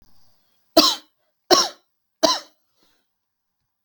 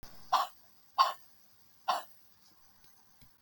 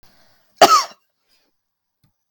{
  "three_cough_length": "3.8 s",
  "three_cough_amplitude": 32768,
  "three_cough_signal_mean_std_ratio": 0.27,
  "exhalation_length": "3.4 s",
  "exhalation_amplitude": 9028,
  "exhalation_signal_mean_std_ratio": 0.31,
  "cough_length": "2.3 s",
  "cough_amplitude": 32768,
  "cough_signal_mean_std_ratio": 0.24,
  "survey_phase": "beta (2021-08-13 to 2022-03-07)",
  "age": "45-64",
  "gender": "Female",
  "wearing_mask": "No",
  "symptom_none": true,
  "smoker_status": "Never smoked",
  "respiratory_condition_asthma": false,
  "respiratory_condition_other": false,
  "recruitment_source": "REACT",
  "submission_delay": "6 days",
  "covid_test_result": "Negative",
  "covid_test_method": "RT-qPCR"
}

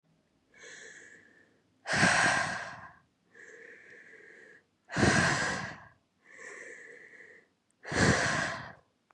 {
  "exhalation_length": "9.1 s",
  "exhalation_amplitude": 8877,
  "exhalation_signal_mean_std_ratio": 0.44,
  "survey_phase": "beta (2021-08-13 to 2022-03-07)",
  "age": "18-44",
  "gender": "Female",
  "wearing_mask": "No",
  "symptom_headache": true,
  "smoker_status": "Never smoked",
  "respiratory_condition_asthma": false,
  "respiratory_condition_other": false,
  "recruitment_source": "Test and Trace",
  "submission_delay": "1 day",
  "covid_test_result": "Positive",
  "covid_test_method": "RT-qPCR",
  "covid_ct_value": 29.6,
  "covid_ct_gene": "N gene",
  "covid_ct_mean": 30.5,
  "covid_viral_load": "100 copies/ml",
  "covid_viral_load_category": "Minimal viral load (< 10K copies/ml)"
}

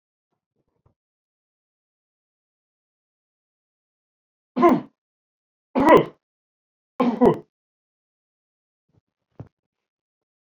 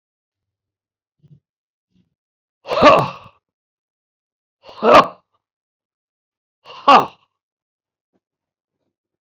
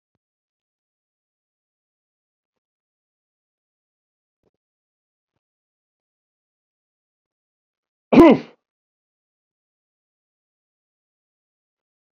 {
  "three_cough_length": "10.6 s",
  "three_cough_amplitude": 31039,
  "three_cough_signal_mean_std_ratio": 0.21,
  "exhalation_length": "9.2 s",
  "exhalation_amplitude": 28710,
  "exhalation_signal_mean_std_ratio": 0.23,
  "cough_length": "12.1 s",
  "cough_amplitude": 27387,
  "cough_signal_mean_std_ratio": 0.12,
  "survey_phase": "beta (2021-08-13 to 2022-03-07)",
  "age": "45-64",
  "gender": "Male",
  "wearing_mask": "No",
  "symptom_none": true,
  "smoker_status": "Ex-smoker",
  "respiratory_condition_asthma": false,
  "respiratory_condition_other": false,
  "recruitment_source": "REACT",
  "submission_delay": "2 days",
  "covid_test_result": "Negative",
  "covid_test_method": "RT-qPCR"
}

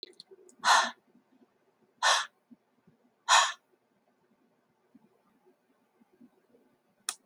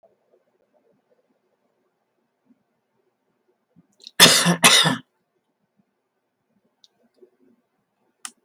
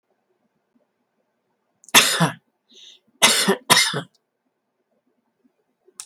{
  "exhalation_length": "7.3 s",
  "exhalation_amplitude": 11582,
  "exhalation_signal_mean_std_ratio": 0.25,
  "cough_length": "8.4 s",
  "cough_amplitude": 32768,
  "cough_signal_mean_std_ratio": 0.22,
  "three_cough_length": "6.1 s",
  "three_cough_amplitude": 32768,
  "three_cough_signal_mean_std_ratio": 0.3,
  "survey_phase": "beta (2021-08-13 to 2022-03-07)",
  "age": "65+",
  "gender": "Female",
  "wearing_mask": "No",
  "symptom_none": true,
  "smoker_status": "Never smoked",
  "respiratory_condition_asthma": false,
  "respiratory_condition_other": false,
  "recruitment_source": "REACT",
  "submission_delay": "1 day",
  "covid_test_result": "Negative",
  "covid_test_method": "RT-qPCR",
  "influenza_a_test_result": "Negative",
  "influenza_b_test_result": "Negative"
}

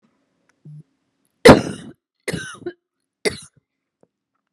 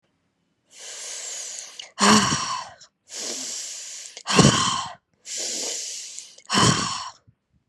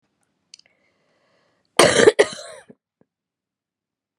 {
  "three_cough_length": "4.5 s",
  "three_cough_amplitude": 32768,
  "three_cough_signal_mean_std_ratio": 0.2,
  "exhalation_length": "7.7 s",
  "exhalation_amplitude": 30793,
  "exhalation_signal_mean_std_ratio": 0.48,
  "cough_length": "4.2 s",
  "cough_amplitude": 32768,
  "cough_signal_mean_std_ratio": 0.23,
  "survey_phase": "beta (2021-08-13 to 2022-03-07)",
  "age": "18-44",
  "gender": "Female",
  "wearing_mask": "No",
  "symptom_fatigue": true,
  "symptom_headache": true,
  "symptom_onset": "8 days",
  "smoker_status": "Never smoked",
  "respiratory_condition_asthma": false,
  "respiratory_condition_other": false,
  "recruitment_source": "REACT",
  "submission_delay": "1 day",
  "covid_test_result": "Negative",
  "covid_test_method": "RT-qPCR",
  "influenza_a_test_result": "Negative",
  "influenza_b_test_result": "Negative"
}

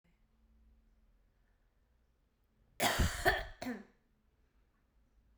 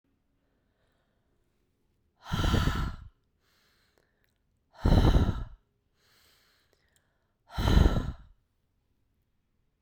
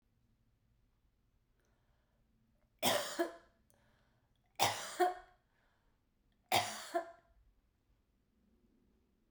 {
  "cough_length": "5.4 s",
  "cough_amplitude": 4948,
  "cough_signal_mean_std_ratio": 0.3,
  "exhalation_length": "9.8 s",
  "exhalation_amplitude": 11943,
  "exhalation_signal_mean_std_ratio": 0.32,
  "three_cough_length": "9.3 s",
  "three_cough_amplitude": 7557,
  "three_cough_signal_mean_std_ratio": 0.29,
  "survey_phase": "beta (2021-08-13 to 2022-03-07)",
  "age": "45-64",
  "gender": "Female",
  "wearing_mask": "No",
  "symptom_runny_or_blocked_nose": true,
  "symptom_diarrhoea": true,
  "symptom_fatigue": true,
  "symptom_change_to_sense_of_smell_or_taste": true,
  "symptom_loss_of_taste": true,
  "smoker_status": "Never smoked",
  "respiratory_condition_asthma": false,
  "respiratory_condition_other": false,
  "recruitment_source": "Test and Trace",
  "submission_delay": "5 days",
  "covid_test_result": "Positive",
  "covid_test_method": "RT-qPCR"
}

